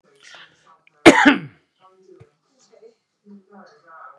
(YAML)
cough_length: 4.2 s
cough_amplitude: 32768
cough_signal_mean_std_ratio: 0.21
survey_phase: beta (2021-08-13 to 2022-03-07)
age: 45-64
gender: Male
wearing_mask: 'No'
symptom_none: true
smoker_status: Never smoked
respiratory_condition_asthma: false
respiratory_condition_other: false
recruitment_source: REACT
submission_delay: 1 day
covid_test_result: Negative
covid_test_method: RT-qPCR
influenza_a_test_result: Negative
influenza_b_test_result: Negative